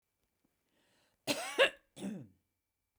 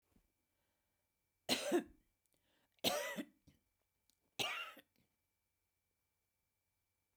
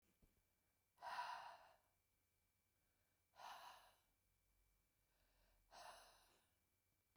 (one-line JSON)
{"cough_length": "3.0 s", "cough_amplitude": 6498, "cough_signal_mean_std_ratio": 0.28, "three_cough_length": "7.2 s", "three_cough_amplitude": 3528, "three_cough_signal_mean_std_ratio": 0.29, "exhalation_length": "7.2 s", "exhalation_amplitude": 392, "exhalation_signal_mean_std_ratio": 0.38, "survey_phase": "beta (2021-08-13 to 2022-03-07)", "age": "45-64", "gender": "Female", "wearing_mask": "No", "symptom_none": true, "smoker_status": "Ex-smoker", "respiratory_condition_asthma": false, "respiratory_condition_other": false, "recruitment_source": "REACT", "submission_delay": "1 day", "covid_test_result": "Negative", "covid_test_method": "RT-qPCR", "influenza_a_test_result": "Unknown/Void", "influenza_b_test_result": "Unknown/Void"}